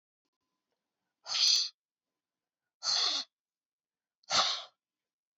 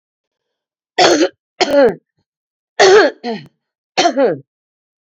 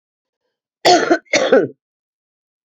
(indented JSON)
{
  "exhalation_length": "5.4 s",
  "exhalation_amplitude": 7650,
  "exhalation_signal_mean_std_ratio": 0.35,
  "three_cough_length": "5.0 s",
  "three_cough_amplitude": 32271,
  "three_cough_signal_mean_std_ratio": 0.44,
  "cough_length": "2.6 s",
  "cough_amplitude": 29696,
  "cough_signal_mean_std_ratio": 0.39,
  "survey_phase": "beta (2021-08-13 to 2022-03-07)",
  "age": "65+",
  "gender": "Female",
  "wearing_mask": "No",
  "symptom_cough_any": true,
  "symptom_sore_throat": true,
  "symptom_diarrhoea": true,
  "symptom_onset": "2 days",
  "smoker_status": "Never smoked",
  "respiratory_condition_asthma": false,
  "respiratory_condition_other": false,
  "recruitment_source": "Test and Trace",
  "submission_delay": "1 day",
  "covid_test_result": "Positive",
  "covid_test_method": "LAMP"
}